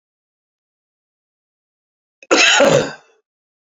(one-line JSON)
{"cough_length": "3.7 s", "cough_amplitude": 32768, "cough_signal_mean_std_ratio": 0.33, "survey_phase": "beta (2021-08-13 to 2022-03-07)", "age": "65+", "gender": "Male", "wearing_mask": "No", "symptom_cough_any": true, "symptom_runny_or_blocked_nose": true, "symptom_fatigue": true, "symptom_change_to_sense_of_smell_or_taste": true, "symptom_loss_of_taste": true, "smoker_status": "Ex-smoker", "respiratory_condition_asthma": true, "respiratory_condition_other": true, "recruitment_source": "Test and Trace", "submission_delay": "1 day", "covid_test_result": "Positive", "covid_test_method": "RT-qPCR", "covid_ct_value": 19.1, "covid_ct_gene": "ORF1ab gene"}